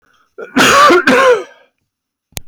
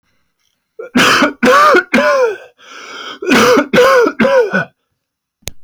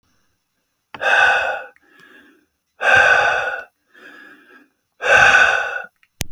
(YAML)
cough_length: 2.5 s
cough_amplitude: 32768
cough_signal_mean_std_ratio: 0.57
three_cough_length: 5.6 s
three_cough_amplitude: 32768
three_cough_signal_mean_std_ratio: 0.66
exhalation_length: 6.3 s
exhalation_amplitude: 31028
exhalation_signal_mean_std_ratio: 0.49
survey_phase: alpha (2021-03-01 to 2021-08-12)
age: 45-64
gender: Male
wearing_mask: 'No'
symptom_none: true
smoker_status: Never smoked
respiratory_condition_asthma: false
respiratory_condition_other: false
recruitment_source: REACT
submission_delay: 1 day
covid_test_result: Negative
covid_test_method: RT-qPCR